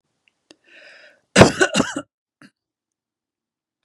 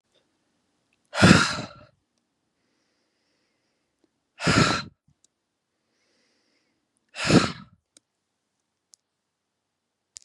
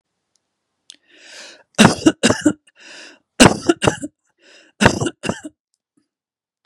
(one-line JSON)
{"cough_length": "3.8 s", "cough_amplitude": 32768, "cough_signal_mean_std_ratio": 0.23, "exhalation_length": "10.2 s", "exhalation_amplitude": 28785, "exhalation_signal_mean_std_ratio": 0.24, "three_cough_length": "6.7 s", "three_cough_amplitude": 32768, "three_cough_signal_mean_std_ratio": 0.3, "survey_phase": "beta (2021-08-13 to 2022-03-07)", "age": "65+", "gender": "Female", "wearing_mask": "No", "symptom_sore_throat": true, "symptom_headache": true, "smoker_status": "Never smoked", "respiratory_condition_asthma": false, "respiratory_condition_other": false, "recruitment_source": "REACT", "submission_delay": "1 day", "covid_test_result": "Negative", "covid_test_method": "RT-qPCR", "influenza_a_test_result": "Unknown/Void", "influenza_b_test_result": "Unknown/Void"}